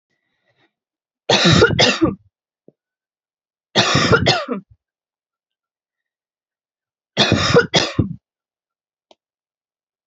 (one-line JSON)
{"three_cough_length": "10.1 s", "three_cough_amplitude": 31818, "three_cough_signal_mean_std_ratio": 0.37, "survey_phase": "beta (2021-08-13 to 2022-03-07)", "age": "18-44", "gender": "Female", "wearing_mask": "No", "symptom_none": true, "smoker_status": "Never smoked", "respiratory_condition_asthma": true, "respiratory_condition_other": false, "recruitment_source": "REACT", "submission_delay": "1 day", "covid_test_result": "Negative", "covid_test_method": "RT-qPCR"}